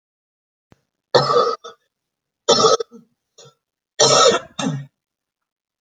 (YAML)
three_cough_length: 5.8 s
three_cough_amplitude: 30715
three_cough_signal_mean_std_ratio: 0.38
survey_phase: beta (2021-08-13 to 2022-03-07)
age: 45-64
gender: Female
wearing_mask: 'No'
symptom_change_to_sense_of_smell_or_taste: true
symptom_loss_of_taste: true
smoker_status: Never smoked
respiratory_condition_asthma: false
respiratory_condition_other: false
recruitment_source: REACT
submission_delay: 2 days
covid_test_result: Negative
covid_test_method: RT-qPCR